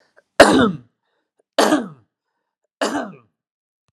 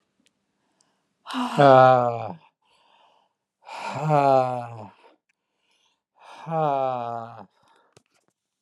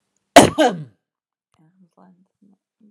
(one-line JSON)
{"three_cough_length": "3.9 s", "three_cough_amplitude": 32768, "three_cough_signal_mean_std_ratio": 0.33, "exhalation_length": "8.6 s", "exhalation_amplitude": 25535, "exhalation_signal_mean_std_ratio": 0.35, "cough_length": "2.9 s", "cough_amplitude": 32768, "cough_signal_mean_std_ratio": 0.23, "survey_phase": "alpha (2021-03-01 to 2021-08-12)", "age": "65+", "gender": "Male", "wearing_mask": "No", "symptom_none": true, "smoker_status": "Ex-smoker", "respiratory_condition_asthma": false, "respiratory_condition_other": false, "recruitment_source": "REACT", "submission_delay": "1 day", "covid_test_result": "Negative", "covid_test_method": "RT-qPCR"}